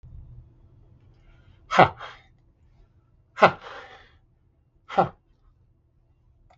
{"exhalation_length": "6.6 s", "exhalation_amplitude": 32766, "exhalation_signal_mean_std_ratio": 0.2, "survey_phase": "beta (2021-08-13 to 2022-03-07)", "age": "65+", "gender": "Male", "wearing_mask": "No", "symptom_none": true, "smoker_status": "Never smoked", "respiratory_condition_asthma": false, "respiratory_condition_other": false, "recruitment_source": "REACT", "submission_delay": "1 day", "covid_test_result": "Negative", "covid_test_method": "RT-qPCR", "influenza_a_test_result": "Negative", "influenza_b_test_result": "Negative"}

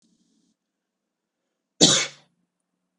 {"cough_length": "3.0 s", "cough_amplitude": 31533, "cough_signal_mean_std_ratio": 0.22, "survey_phase": "beta (2021-08-13 to 2022-03-07)", "age": "18-44", "gender": "Male", "wearing_mask": "No", "symptom_none": true, "smoker_status": "Ex-smoker", "respiratory_condition_asthma": false, "respiratory_condition_other": false, "recruitment_source": "REACT", "submission_delay": "1 day", "covid_test_result": "Negative", "covid_test_method": "RT-qPCR"}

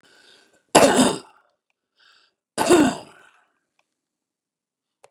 {"cough_length": "5.1 s", "cough_amplitude": 32767, "cough_signal_mean_std_ratio": 0.29, "survey_phase": "beta (2021-08-13 to 2022-03-07)", "age": "65+", "gender": "Male", "wearing_mask": "No", "symptom_none": true, "smoker_status": "Ex-smoker", "respiratory_condition_asthma": false, "respiratory_condition_other": false, "recruitment_source": "REACT", "submission_delay": "3 days", "covid_test_result": "Negative", "covid_test_method": "RT-qPCR", "influenza_a_test_result": "Negative", "influenza_b_test_result": "Negative"}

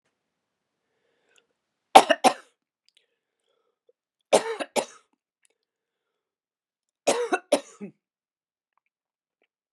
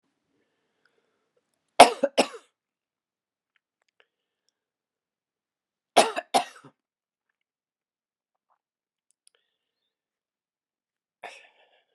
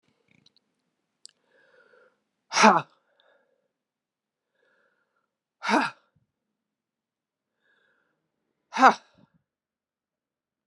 {"three_cough_length": "9.7 s", "three_cough_amplitude": 32768, "three_cough_signal_mean_std_ratio": 0.18, "cough_length": "11.9 s", "cough_amplitude": 32768, "cough_signal_mean_std_ratio": 0.13, "exhalation_length": "10.7 s", "exhalation_amplitude": 27832, "exhalation_signal_mean_std_ratio": 0.17, "survey_phase": "beta (2021-08-13 to 2022-03-07)", "age": "65+", "gender": "Female", "wearing_mask": "No", "symptom_cough_any": true, "symptom_runny_or_blocked_nose": true, "symptom_fatigue": true, "symptom_fever_high_temperature": true, "symptom_headache": true, "symptom_onset": "3 days", "smoker_status": "Never smoked", "respiratory_condition_asthma": true, "respiratory_condition_other": false, "recruitment_source": "Test and Trace", "submission_delay": "1 day", "covid_test_result": "Positive", "covid_test_method": "RT-qPCR", "covid_ct_value": 19.3, "covid_ct_gene": "ORF1ab gene", "covid_ct_mean": 20.4, "covid_viral_load": "200000 copies/ml", "covid_viral_load_category": "Low viral load (10K-1M copies/ml)"}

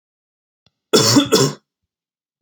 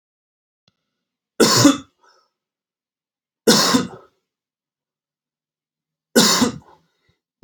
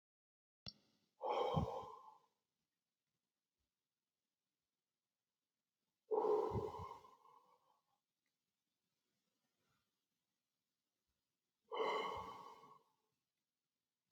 {"cough_length": "2.4 s", "cough_amplitude": 29543, "cough_signal_mean_std_ratio": 0.38, "three_cough_length": "7.4 s", "three_cough_amplitude": 30309, "three_cough_signal_mean_std_ratio": 0.31, "exhalation_length": "14.1 s", "exhalation_amplitude": 1599, "exhalation_signal_mean_std_ratio": 0.31, "survey_phase": "alpha (2021-03-01 to 2021-08-12)", "age": "18-44", "gender": "Male", "wearing_mask": "No", "symptom_new_continuous_cough": true, "symptom_fatigue": true, "symptom_headache": true, "smoker_status": "Never smoked", "respiratory_condition_asthma": true, "respiratory_condition_other": false, "recruitment_source": "Test and Trace", "submission_delay": "2 days", "covid_test_result": "Positive", "covid_test_method": "RT-qPCR", "covid_ct_value": 21.2, "covid_ct_gene": "ORF1ab gene", "covid_ct_mean": 22.4, "covid_viral_load": "44000 copies/ml", "covid_viral_load_category": "Low viral load (10K-1M copies/ml)"}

